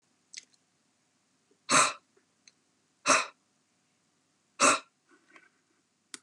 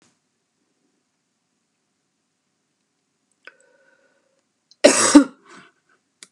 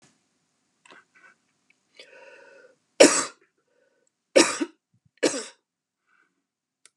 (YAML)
exhalation_length: 6.2 s
exhalation_amplitude: 12534
exhalation_signal_mean_std_ratio: 0.25
cough_length: 6.3 s
cough_amplitude: 32768
cough_signal_mean_std_ratio: 0.18
three_cough_length: 7.0 s
three_cough_amplitude: 30743
three_cough_signal_mean_std_ratio: 0.21
survey_phase: beta (2021-08-13 to 2022-03-07)
age: 65+
gender: Female
wearing_mask: 'No'
symptom_none: true
smoker_status: Never smoked
respiratory_condition_asthma: false
respiratory_condition_other: false
recruitment_source: REACT
submission_delay: 2 days
covid_test_result: Negative
covid_test_method: RT-qPCR
influenza_a_test_result: Negative
influenza_b_test_result: Negative